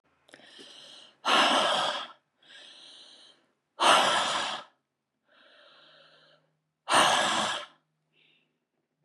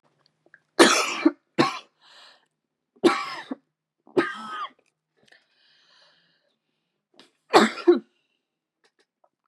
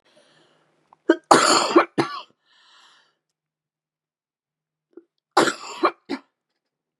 exhalation_length: 9.0 s
exhalation_amplitude: 13567
exhalation_signal_mean_std_ratio: 0.42
three_cough_length: 9.5 s
three_cough_amplitude: 32666
three_cough_signal_mean_std_ratio: 0.28
cough_length: 7.0 s
cough_amplitude: 32767
cough_signal_mean_std_ratio: 0.28
survey_phase: beta (2021-08-13 to 2022-03-07)
age: 45-64
gender: Female
wearing_mask: 'Yes'
symptom_cough_any: true
symptom_new_continuous_cough: true
symptom_runny_or_blocked_nose: true
symptom_sore_throat: true
symptom_diarrhoea: true
symptom_fatigue: true
smoker_status: Never smoked
respiratory_condition_asthma: true
respiratory_condition_other: false
recruitment_source: Test and Trace
submission_delay: 2 days
covid_test_result: Positive
covid_test_method: RT-qPCR
covid_ct_value: 24.0
covid_ct_gene: N gene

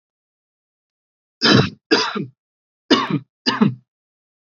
three_cough_length: 4.5 s
three_cough_amplitude: 28461
three_cough_signal_mean_std_ratio: 0.36
survey_phase: beta (2021-08-13 to 2022-03-07)
age: 18-44
gender: Male
wearing_mask: 'No'
symptom_none: true
smoker_status: Never smoked
respiratory_condition_asthma: false
respiratory_condition_other: false
recruitment_source: REACT
submission_delay: 1 day
covid_test_result: Negative
covid_test_method: RT-qPCR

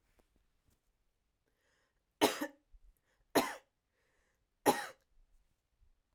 three_cough_length: 6.1 s
three_cough_amplitude: 7784
three_cough_signal_mean_std_ratio: 0.21
survey_phase: alpha (2021-03-01 to 2021-08-12)
age: 18-44
gender: Female
wearing_mask: 'No'
symptom_none: true
smoker_status: Never smoked
respiratory_condition_asthma: false
respiratory_condition_other: false
recruitment_source: REACT
submission_delay: 1 day
covid_test_result: Negative
covid_test_method: RT-qPCR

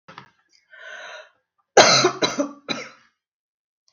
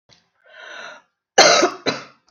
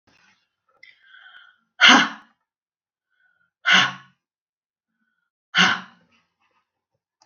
three_cough_length: 3.9 s
three_cough_amplitude: 32767
three_cough_signal_mean_std_ratio: 0.31
cough_length: 2.3 s
cough_amplitude: 32768
cough_signal_mean_std_ratio: 0.36
exhalation_length: 7.3 s
exhalation_amplitude: 32768
exhalation_signal_mean_std_ratio: 0.25
survey_phase: beta (2021-08-13 to 2022-03-07)
age: 45-64
gender: Female
wearing_mask: 'No'
symptom_cough_any: true
symptom_runny_or_blocked_nose: true
symptom_sore_throat: true
symptom_diarrhoea: true
symptom_fatigue: true
symptom_change_to_sense_of_smell_or_taste: true
smoker_status: Never smoked
respiratory_condition_asthma: false
respiratory_condition_other: false
recruitment_source: Test and Trace
submission_delay: 0 days
covid_test_result: Negative
covid_test_method: LFT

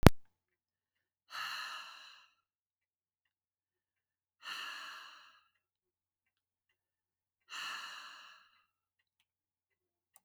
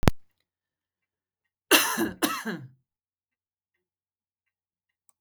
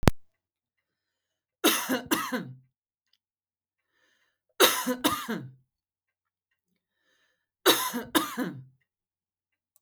exhalation_length: 10.2 s
exhalation_amplitude: 32768
exhalation_signal_mean_std_ratio: 0.15
cough_length: 5.2 s
cough_amplitude: 32768
cough_signal_mean_std_ratio: 0.27
three_cough_length: 9.8 s
three_cough_amplitude: 32768
three_cough_signal_mean_std_ratio: 0.32
survey_phase: beta (2021-08-13 to 2022-03-07)
age: 45-64
gender: Female
wearing_mask: 'No'
symptom_none: true
smoker_status: Ex-smoker
respiratory_condition_asthma: false
respiratory_condition_other: false
recruitment_source: REACT
submission_delay: 2 days
covid_test_result: Negative
covid_test_method: RT-qPCR
influenza_a_test_result: Negative
influenza_b_test_result: Negative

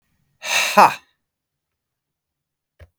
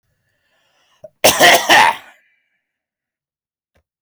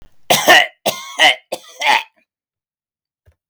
exhalation_length: 3.0 s
exhalation_amplitude: 32768
exhalation_signal_mean_std_ratio: 0.26
cough_length: 4.0 s
cough_amplitude: 32768
cough_signal_mean_std_ratio: 0.33
three_cough_length: 3.5 s
three_cough_amplitude: 32768
three_cough_signal_mean_std_ratio: 0.39
survey_phase: beta (2021-08-13 to 2022-03-07)
age: 45-64
gender: Male
wearing_mask: 'No'
symptom_none: true
smoker_status: Current smoker (11 or more cigarettes per day)
respiratory_condition_asthma: false
respiratory_condition_other: false
recruitment_source: REACT
submission_delay: 4 days
covid_test_result: Negative
covid_test_method: RT-qPCR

